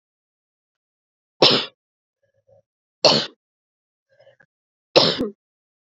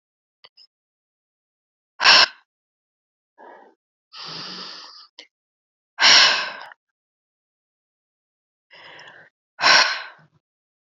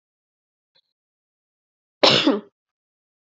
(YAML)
three_cough_length: 5.8 s
three_cough_amplitude: 29582
three_cough_signal_mean_std_ratio: 0.26
exhalation_length: 10.9 s
exhalation_amplitude: 30508
exhalation_signal_mean_std_ratio: 0.26
cough_length: 3.3 s
cough_amplitude: 31146
cough_signal_mean_std_ratio: 0.25
survey_phase: beta (2021-08-13 to 2022-03-07)
age: 18-44
gender: Female
wearing_mask: 'No'
symptom_none: true
smoker_status: Ex-smoker
respiratory_condition_asthma: false
respiratory_condition_other: false
recruitment_source: REACT
submission_delay: 2 days
covid_test_result: Negative
covid_test_method: RT-qPCR
influenza_a_test_result: Negative
influenza_b_test_result: Negative